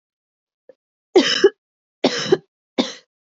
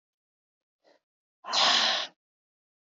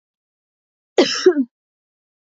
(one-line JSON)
{"three_cough_length": "3.3 s", "three_cough_amplitude": 26297, "three_cough_signal_mean_std_ratio": 0.32, "exhalation_length": "2.9 s", "exhalation_amplitude": 10585, "exhalation_signal_mean_std_ratio": 0.36, "cough_length": "2.4 s", "cough_amplitude": 26382, "cough_signal_mean_std_ratio": 0.29, "survey_phase": "beta (2021-08-13 to 2022-03-07)", "age": "18-44", "gender": "Female", "wearing_mask": "No", "symptom_cough_any": true, "symptom_sore_throat": true, "symptom_fatigue": true, "symptom_headache": true, "symptom_change_to_sense_of_smell_or_taste": true, "symptom_loss_of_taste": true, "symptom_onset": "5 days", "smoker_status": "Never smoked", "respiratory_condition_asthma": false, "respiratory_condition_other": false, "recruitment_source": "Test and Trace", "submission_delay": "2 days", "covid_test_result": "Positive", "covid_test_method": "RT-qPCR"}